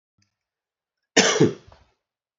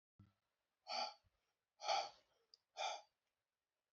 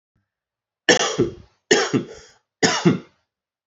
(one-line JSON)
{"cough_length": "2.4 s", "cough_amplitude": 27333, "cough_signal_mean_std_ratio": 0.29, "exhalation_length": "3.9 s", "exhalation_amplitude": 1631, "exhalation_signal_mean_std_ratio": 0.34, "three_cough_length": "3.7 s", "three_cough_amplitude": 29426, "three_cough_signal_mean_std_ratio": 0.4, "survey_phase": "alpha (2021-03-01 to 2021-08-12)", "age": "18-44", "gender": "Male", "wearing_mask": "No", "symptom_cough_any": true, "symptom_new_continuous_cough": true, "symptom_diarrhoea": true, "symptom_fatigue": true, "symptom_fever_high_temperature": true, "symptom_change_to_sense_of_smell_or_taste": true, "smoker_status": "Current smoker (1 to 10 cigarettes per day)", "respiratory_condition_asthma": false, "respiratory_condition_other": false, "recruitment_source": "Test and Trace", "submission_delay": "2 days", "covid_test_result": "Positive", "covid_test_method": "RT-qPCR"}